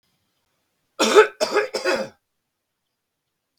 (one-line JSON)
{"cough_length": "3.6 s", "cough_amplitude": 32768, "cough_signal_mean_std_ratio": 0.33, "survey_phase": "beta (2021-08-13 to 2022-03-07)", "age": "45-64", "gender": "Male", "wearing_mask": "No", "symptom_none": true, "smoker_status": "Current smoker (11 or more cigarettes per day)", "respiratory_condition_asthma": false, "respiratory_condition_other": false, "recruitment_source": "REACT", "submission_delay": "1 day", "covid_test_result": "Negative", "covid_test_method": "RT-qPCR", "influenza_a_test_result": "Unknown/Void", "influenza_b_test_result": "Unknown/Void"}